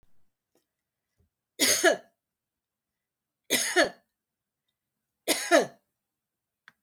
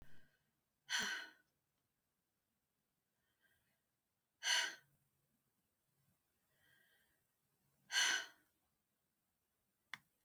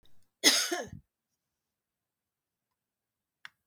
{"three_cough_length": "6.8 s", "three_cough_amplitude": 14939, "three_cough_signal_mean_std_ratio": 0.29, "exhalation_length": "10.2 s", "exhalation_amplitude": 2206, "exhalation_signal_mean_std_ratio": 0.26, "cough_length": "3.7 s", "cough_amplitude": 13096, "cough_signal_mean_std_ratio": 0.23, "survey_phase": "beta (2021-08-13 to 2022-03-07)", "age": "65+", "gender": "Female", "wearing_mask": "No", "symptom_none": true, "smoker_status": "Ex-smoker", "respiratory_condition_asthma": false, "respiratory_condition_other": false, "recruitment_source": "REACT", "submission_delay": "1 day", "covid_test_result": "Negative", "covid_test_method": "RT-qPCR", "influenza_a_test_result": "Negative", "influenza_b_test_result": "Negative"}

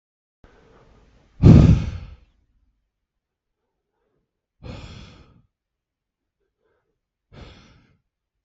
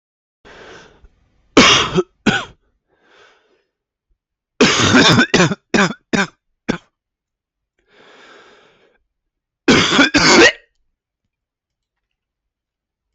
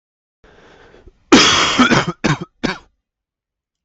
{"exhalation_length": "8.4 s", "exhalation_amplitude": 32768, "exhalation_signal_mean_std_ratio": 0.19, "three_cough_length": "13.1 s", "three_cough_amplitude": 32768, "three_cough_signal_mean_std_ratio": 0.37, "cough_length": "3.8 s", "cough_amplitude": 32768, "cough_signal_mean_std_ratio": 0.41, "survey_phase": "beta (2021-08-13 to 2022-03-07)", "age": "18-44", "gender": "Male", "wearing_mask": "No", "symptom_cough_any": true, "symptom_new_continuous_cough": true, "symptom_runny_or_blocked_nose": true, "symptom_shortness_of_breath": true, "symptom_sore_throat": true, "symptom_headache": true, "symptom_change_to_sense_of_smell_or_taste": true, "symptom_loss_of_taste": true, "symptom_onset": "3 days", "smoker_status": "Never smoked", "respiratory_condition_asthma": false, "respiratory_condition_other": false, "recruitment_source": "Test and Trace", "submission_delay": "2 days", "covid_test_result": "Positive", "covid_test_method": "RT-qPCR", "covid_ct_value": 13.0, "covid_ct_gene": "N gene", "covid_ct_mean": 14.0, "covid_viral_load": "25000000 copies/ml", "covid_viral_load_category": "High viral load (>1M copies/ml)"}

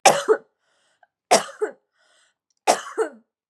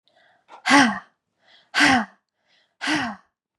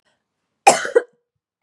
{"three_cough_length": "3.5 s", "three_cough_amplitude": 32767, "three_cough_signal_mean_std_ratio": 0.32, "exhalation_length": "3.6 s", "exhalation_amplitude": 27725, "exhalation_signal_mean_std_ratio": 0.38, "cough_length": "1.6 s", "cough_amplitude": 32768, "cough_signal_mean_std_ratio": 0.26, "survey_phase": "beta (2021-08-13 to 2022-03-07)", "age": "18-44", "gender": "Female", "wearing_mask": "No", "symptom_none": true, "smoker_status": "Never smoked", "respiratory_condition_asthma": false, "respiratory_condition_other": false, "recruitment_source": "REACT", "submission_delay": "1 day", "covid_test_result": "Negative", "covid_test_method": "RT-qPCR", "influenza_a_test_result": "Negative", "influenza_b_test_result": "Negative"}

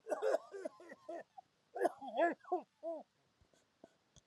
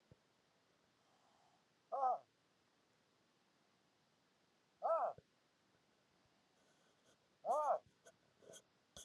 {"cough_length": "4.3 s", "cough_amplitude": 3339, "cough_signal_mean_std_ratio": 0.41, "exhalation_length": "9.0 s", "exhalation_amplitude": 1502, "exhalation_signal_mean_std_ratio": 0.29, "survey_phase": "alpha (2021-03-01 to 2021-08-12)", "age": "45-64", "gender": "Male", "wearing_mask": "No", "symptom_none": true, "smoker_status": "Never smoked", "respiratory_condition_asthma": false, "respiratory_condition_other": true, "recruitment_source": "REACT", "submission_delay": "1 day", "covid_test_result": "Negative", "covid_test_method": "RT-qPCR"}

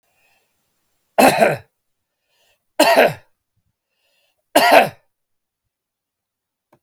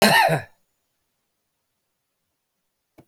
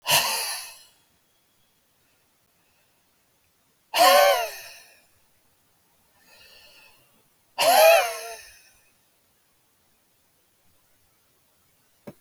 {"three_cough_length": "6.8 s", "three_cough_amplitude": 32768, "three_cough_signal_mean_std_ratio": 0.3, "cough_length": "3.1 s", "cough_amplitude": 26813, "cough_signal_mean_std_ratio": 0.28, "exhalation_length": "12.2 s", "exhalation_amplitude": 21802, "exhalation_signal_mean_std_ratio": 0.29, "survey_phase": "beta (2021-08-13 to 2022-03-07)", "age": "65+", "gender": "Male", "wearing_mask": "No", "symptom_cough_any": true, "symptom_runny_or_blocked_nose": true, "symptom_shortness_of_breath": true, "symptom_sore_throat": true, "symptom_fatigue": true, "symptom_fever_high_temperature": true, "symptom_headache": true, "symptom_change_to_sense_of_smell_or_taste": true, "symptom_onset": "2 days", "smoker_status": "Never smoked", "respiratory_condition_asthma": false, "respiratory_condition_other": false, "recruitment_source": "Test and Trace", "submission_delay": "2 days", "covid_test_result": "Positive", "covid_test_method": "RT-qPCR", "covid_ct_value": 29.0, "covid_ct_gene": "N gene"}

